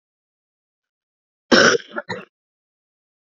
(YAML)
cough_length: 3.2 s
cough_amplitude: 30302
cough_signal_mean_std_ratio: 0.25
survey_phase: beta (2021-08-13 to 2022-03-07)
age: 18-44
gender: Female
wearing_mask: 'No'
symptom_cough_any: true
symptom_shortness_of_breath: true
symptom_sore_throat: true
symptom_fatigue: true
symptom_headache: true
smoker_status: Never smoked
respiratory_condition_asthma: false
respiratory_condition_other: false
recruitment_source: Test and Trace
submission_delay: 2 days
covid_test_result: Positive
covid_test_method: LFT